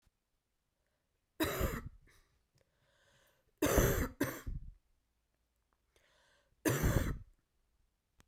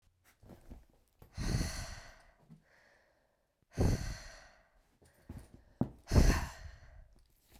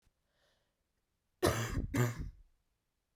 {
  "three_cough_length": "8.3 s",
  "three_cough_amplitude": 6495,
  "three_cough_signal_mean_std_ratio": 0.36,
  "exhalation_length": "7.6 s",
  "exhalation_amplitude": 7264,
  "exhalation_signal_mean_std_ratio": 0.33,
  "cough_length": "3.2 s",
  "cough_amplitude": 5352,
  "cough_signal_mean_std_ratio": 0.38,
  "survey_phase": "beta (2021-08-13 to 2022-03-07)",
  "age": "18-44",
  "gender": "Female",
  "wearing_mask": "No",
  "symptom_cough_any": true,
  "symptom_new_continuous_cough": true,
  "symptom_runny_or_blocked_nose": true,
  "symptom_shortness_of_breath": true,
  "symptom_sore_throat": true,
  "symptom_fatigue": true,
  "symptom_fever_high_temperature": true,
  "symptom_change_to_sense_of_smell_or_taste": true,
  "symptom_onset": "5 days",
  "smoker_status": "Never smoked",
  "respiratory_condition_asthma": false,
  "respiratory_condition_other": false,
  "recruitment_source": "Test and Trace",
  "submission_delay": "2 days",
  "covid_test_result": "Positive",
  "covid_test_method": "RT-qPCR"
}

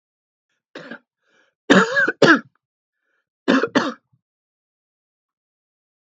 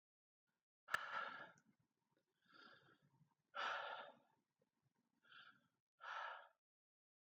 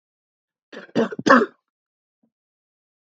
{
  "three_cough_length": "6.1 s",
  "three_cough_amplitude": 32767,
  "three_cough_signal_mean_std_ratio": 0.29,
  "exhalation_length": "7.3 s",
  "exhalation_amplitude": 1789,
  "exhalation_signal_mean_std_ratio": 0.36,
  "cough_length": "3.1 s",
  "cough_amplitude": 32767,
  "cough_signal_mean_std_ratio": 0.25,
  "survey_phase": "beta (2021-08-13 to 2022-03-07)",
  "age": "65+",
  "gender": "Male",
  "wearing_mask": "No",
  "symptom_none": true,
  "smoker_status": "Never smoked",
  "respiratory_condition_asthma": true,
  "respiratory_condition_other": false,
  "recruitment_source": "REACT",
  "submission_delay": "2 days",
  "covid_test_result": "Negative",
  "covid_test_method": "RT-qPCR",
  "influenza_a_test_result": "Negative",
  "influenza_b_test_result": "Negative"
}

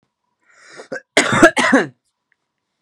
{
  "cough_length": "2.8 s",
  "cough_amplitude": 32768,
  "cough_signal_mean_std_ratio": 0.36,
  "survey_phase": "beta (2021-08-13 to 2022-03-07)",
  "age": "18-44",
  "gender": "Female",
  "wearing_mask": "No",
  "symptom_none": true,
  "smoker_status": "Current smoker (1 to 10 cigarettes per day)",
  "respiratory_condition_asthma": false,
  "respiratory_condition_other": false,
  "recruitment_source": "REACT",
  "submission_delay": "3 days",
  "covid_test_result": "Negative",
  "covid_test_method": "RT-qPCR",
  "influenza_a_test_result": "Negative",
  "influenza_b_test_result": "Negative"
}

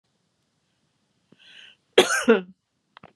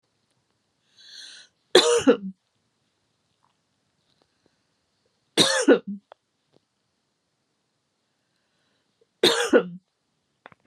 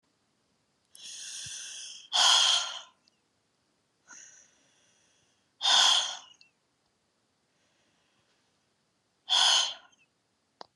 {
  "cough_length": "3.2 s",
  "cough_amplitude": 28893,
  "cough_signal_mean_std_ratio": 0.25,
  "three_cough_length": "10.7 s",
  "three_cough_amplitude": 31152,
  "three_cough_signal_mean_std_ratio": 0.26,
  "exhalation_length": "10.8 s",
  "exhalation_amplitude": 11449,
  "exhalation_signal_mean_std_ratio": 0.33,
  "survey_phase": "beta (2021-08-13 to 2022-03-07)",
  "age": "45-64",
  "gender": "Female",
  "wearing_mask": "No",
  "symptom_change_to_sense_of_smell_or_taste": true,
  "symptom_loss_of_taste": true,
  "smoker_status": "Ex-smoker",
  "respiratory_condition_asthma": false,
  "respiratory_condition_other": false,
  "recruitment_source": "REACT",
  "submission_delay": "2 days",
  "covid_test_result": "Negative",
  "covid_test_method": "RT-qPCR"
}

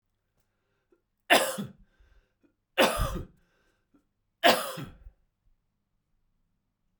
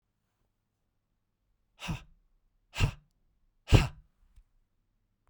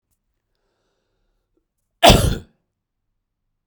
{
  "three_cough_length": "7.0 s",
  "three_cough_amplitude": 17698,
  "three_cough_signal_mean_std_ratio": 0.27,
  "exhalation_length": "5.3 s",
  "exhalation_amplitude": 18086,
  "exhalation_signal_mean_std_ratio": 0.19,
  "cough_length": "3.7 s",
  "cough_amplitude": 32768,
  "cough_signal_mean_std_ratio": 0.21,
  "survey_phase": "beta (2021-08-13 to 2022-03-07)",
  "age": "45-64",
  "gender": "Male",
  "wearing_mask": "No",
  "symptom_cough_any": true,
  "symptom_runny_or_blocked_nose": true,
  "symptom_change_to_sense_of_smell_or_taste": true,
  "symptom_loss_of_taste": true,
  "smoker_status": "Ex-smoker",
  "respiratory_condition_asthma": false,
  "respiratory_condition_other": false,
  "recruitment_source": "Test and Trace",
  "submission_delay": "2 days",
  "covid_test_result": "Positive",
  "covid_test_method": "RT-qPCR",
  "covid_ct_value": 15.8,
  "covid_ct_gene": "ORF1ab gene",
  "covid_ct_mean": 16.2,
  "covid_viral_load": "4800000 copies/ml",
  "covid_viral_load_category": "High viral load (>1M copies/ml)"
}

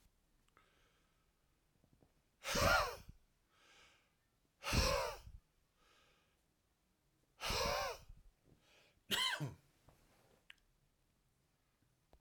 {
  "exhalation_length": "12.2 s",
  "exhalation_amplitude": 3152,
  "exhalation_signal_mean_std_ratio": 0.33,
  "survey_phase": "alpha (2021-03-01 to 2021-08-12)",
  "age": "65+",
  "gender": "Male",
  "wearing_mask": "No",
  "symptom_none": true,
  "smoker_status": "Ex-smoker",
  "respiratory_condition_asthma": false,
  "respiratory_condition_other": false,
  "recruitment_source": "REACT",
  "submission_delay": "2 days",
  "covid_test_result": "Negative",
  "covid_test_method": "RT-qPCR"
}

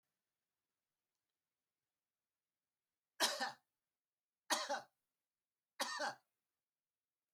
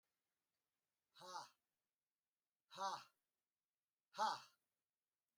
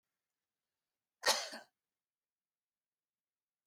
{
  "three_cough_length": "7.3 s",
  "three_cough_amplitude": 3421,
  "three_cough_signal_mean_std_ratio": 0.26,
  "exhalation_length": "5.4 s",
  "exhalation_amplitude": 1021,
  "exhalation_signal_mean_std_ratio": 0.26,
  "cough_length": "3.7 s",
  "cough_amplitude": 4494,
  "cough_signal_mean_std_ratio": 0.18,
  "survey_phase": "beta (2021-08-13 to 2022-03-07)",
  "age": "65+",
  "gender": "Male",
  "wearing_mask": "No",
  "symptom_none": true,
  "smoker_status": "Never smoked",
  "respiratory_condition_asthma": false,
  "respiratory_condition_other": false,
  "recruitment_source": "REACT",
  "submission_delay": "2 days",
  "covid_test_result": "Negative",
  "covid_test_method": "RT-qPCR"
}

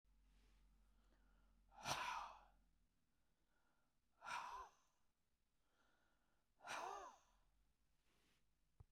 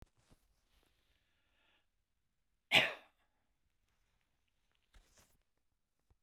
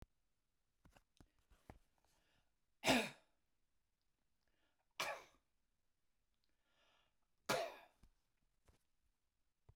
{
  "exhalation_length": "8.9 s",
  "exhalation_amplitude": 960,
  "exhalation_signal_mean_std_ratio": 0.38,
  "cough_length": "6.2 s",
  "cough_amplitude": 7322,
  "cough_signal_mean_std_ratio": 0.14,
  "three_cough_length": "9.8 s",
  "three_cough_amplitude": 2617,
  "three_cough_signal_mean_std_ratio": 0.21,
  "survey_phase": "beta (2021-08-13 to 2022-03-07)",
  "age": "65+",
  "gender": "Male",
  "wearing_mask": "No",
  "symptom_none": true,
  "smoker_status": "Ex-smoker",
  "respiratory_condition_asthma": false,
  "respiratory_condition_other": false,
  "recruitment_source": "REACT",
  "submission_delay": "3 days",
  "covid_test_result": "Negative",
  "covid_test_method": "RT-qPCR"
}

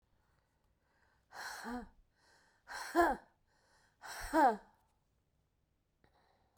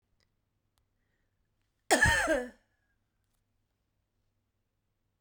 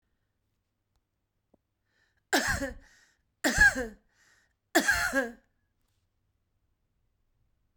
{
  "exhalation_length": "6.6 s",
  "exhalation_amplitude": 4211,
  "exhalation_signal_mean_std_ratio": 0.29,
  "cough_length": "5.2 s",
  "cough_amplitude": 9671,
  "cough_signal_mean_std_ratio": 0.25,
  "three_cough_length": "7.8 s",
  "three_cough_amplitude": 11291,
  "three_cough_signal_mean_std_ratio": 0.3,
  "survey_phase": "beta (2021-08-13 to 2022-03-07)",
  "age": "65+",
  "gender": "Female",
  "wearing_mask": "No",
  "symptom_cough_any": true,
  "symptom_runny_or_blocked_nose": true,
  "symptom_shortness_of_breath": true,
  "symptom_sore_throat": true,
  "symptom_fatigue": true,
  "symptom_headache": true,
  "symptom_onset": "3 days",
  "smoker_status": "Current smoker (e-cigarettes or vapes only)",
  "respiratory_condition_asthma": false,
  "respiratory_condition_other": false,
  "recruitment_source": "Test and Trace",
  "submission_delay": "1 day",
  "covid_test_result": "Positive",
  "covid_test_method": "RT-qPCR",
  "covid_ct_value": 25.8,
  "covid_ct_gene": "ORF1ab gene",
  "covid_ct_mean": 26.4,
  "covid_viral_load": "2200 copies/ml",
  "covid_viral_load_category": "Minimal viral load (< 10K copies/ml)"
}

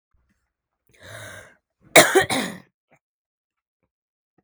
{
  "cough_length": "4.4 s",
  "cough_amplitude": 32768,
  "cough_signal_mean_std_ratio": 0.23,
  "survey_phase": "beta (2021-08-13 to 2022-03-07)",
  "age": "18-44",
  "gender": "Female",
  "wearing_mask": "No",
  "symptom_cough_any": true,
  "symptom_runny_or_blocked_nose": true,
  "symptom_sore_throat": true,
  "symptom_headache": true,
  "smoker_status": "Never smoked",
  "respiratory_condition_asthma": false,
  "respiratory_condition_other": false,
  "recruitment_source": "Test and Trace",
  "submission_delay": "1 day",
  "covid_test_result": "Positive",
  "covid_test_method": "RT-qPCR",
  "covid_ct_value": 20.0,
  "covid_ct_gene": "ORF1ab gene",
  "covid_ct_mean": 20.5,
  "covid_viral_load": "190000 copies/ml",
  "covid_viral_load_category": "Low viral load (10K-1M copies/ml)"
}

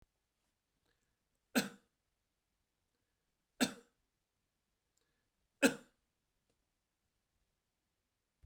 {
  "three_cough_length": "8.5 s",
  "three_cough_amplitude": 6182,
  "three_cough_signal_mean_std_ratio": 0.14,
  "survey_phase": "beta (2021-08-13 to 2022-03-07)",
  "age": "65+",
  "gender": "Male",
  "wearing_mask": "No",
  "symptom_none": true,
  "smoker_status": "Never smoked",
  "respiratory_condition_asthma": false,
  "respiratory_condition_other": false,
  "recruitment_source": "REACT",
  "submission_delay": "2 days",
  "covid_test_result": "Negative",
  "covid_test_method": "RT-qPCR"
}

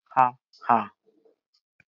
{
  "exhalation_length": "1.9 s",
  "exhalation_amplitude": 18795,
  "exhalation_signal_mean_std_ratio": 0.27,
  "survey_phase": "beta (2021-08-13 to 2022-03-07)",
  "age": "65+",
  "gender": "Female",
  "wearing_mask": "Prefer not to say",
  "symptom_none": true,
  "smoker_status": "Never smoked",
  "respiratory_condition_asthma": false,
  "respiratory_condition_other": false,
  "recruitment_source": "REACT",
  "submission_delay": "2 days",
  "covid_test_result": "Negative",
  "covid_test_method": "RT-qPCR",
  "influenza_a_test_result": "Negative",
  "influenza_b_test_result": "Negative"
}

